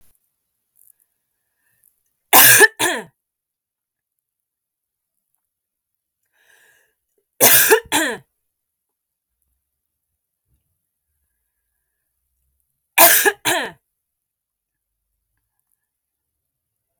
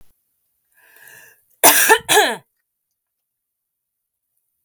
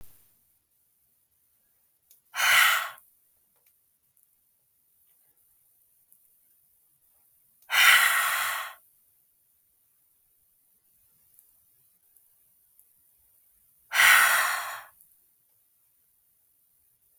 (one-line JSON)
{"three_cough_length": "17.0 s", "three_cough_amplitude": 32768, "three_cough_signal_mean_std_ratio": 0.23, "cough_length": "4.6 s", "cough_amplitude": 32768, "cough_signal_mean_std_ratio": 0.28, "exhalation_length": "17.2 s", "exhalation_amplitude": 18322, "exhalation_signal_mean_std_ratio": 0.28, "survey_phase": "beta (2021-08-13 to 2022-03-07)", "age": "45-64", "gender": "Female", "wearing_mask": "No", "symptom_sore_throat": true, "symptom_headache": true, "symptom_onset": "3 days", "smoker_status": "Ex-smoker", "respiratory_condition_asthma": false, "respiratory_condition_other": false, "recruitment_source": "REACT", "submission_delay": "0 days", "covid_test_result": "Negative", "covid_test_method": "RT-qPCR"}